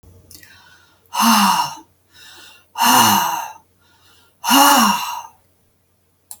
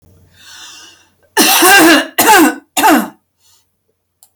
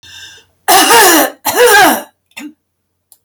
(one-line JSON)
{"exhalation_length": "6.4 s", "exhalation_amplitude": 32768, "exhalation_signal_mean_std_ratio": 0.47, "three_cough_length": "4.4 s", "three_cough_amplitude": 32768, "three_cough_signal_mean_std_ratio": 0.52, "cough_length": "3.2 s", "cough_amplitude": 32768, "cough_signal_mean_std_ratio": 0.58, "survey_phase": "alpha (2021-03-01 to 2021-08-12)", "age": "65+", "gender": "Female", "wearing_mask": "No", "symptom_none": true, "smoker_status": "Never smoked", "respiratory_condition_asthma": false, "respiratory_condition_other": false, "recruitment_source": "REACT", "submission_delay": "1 day", "covid_test_result": "Negative", "covid_test_method": "RT-qPCR"}